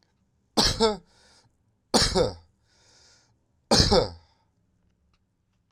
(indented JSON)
{
  "three_cough_length": "5.7 s",
  "three_cough_amplitude": 19175,
  "three_cough_signal_mean_std_ratio": 0.35,
  "survey_phase": "beta (2021-08-13 to 2022-03-07)",
  "age": "18-44",
  "gender": "Male",
  "wearing_mask": "No",
  "symptom_cough_any": true,
  "symptom_change_to_sense_of_smell_or_taste": true,
  "symptom_onset": "3 days",
  "smoker_status": "Never smoked",
  "respiratory_condition_asthma": false,
  "respiratory_condition_other": false,
  "recruitment_source": "Test and Trace",
  "submission_delay": "2 days",
  "covid_test_result": "Positive",
  "covid_test_method": "RT-qPCR",
  "covid_ct_value": 18.7,
  "covid_ct_gene": "ORF1ab gene",
  "covid_ct_mean": 19.5,
  "covid_viral_load": "390000 copies/ml",
  "covid_viral_load_category": "Low viral load (10K-1M copies/ml)"
}